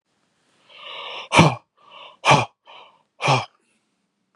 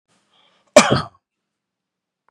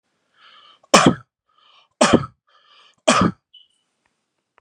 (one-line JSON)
{"exhalation_length": "4.4 s", "exhalation_amplitude": 32330, "exhalation_signal_mean_std_ratio": 0.32, "cough_length": "2.3 s", "cough_amplitude": 32768, "cough_signal_mean_std_ratio": 0.22, "three_cough_length": "4.6 s", "three_cough_amplitude": 32768, "three_cough_signal_mean_std_ratio": 0.29, "survey_phase": "beta (2021-08-13 to 2022-03-07)", "age": "18-44", "gender": "Male", "wearing_mask": "No", "symptom_none": true, "smoker_status": "Never smoked", "respiratory_condition_asthma": false, "respiratory_condition_other": false, "recruitment_source": "REACT", "submission_delay": "1 day", "covid_test_result": "Negative", "covid_test_method": "RT-qPCR", "influenza_a_test_result": "Negative", "influenza_b_test_result": "Negative"}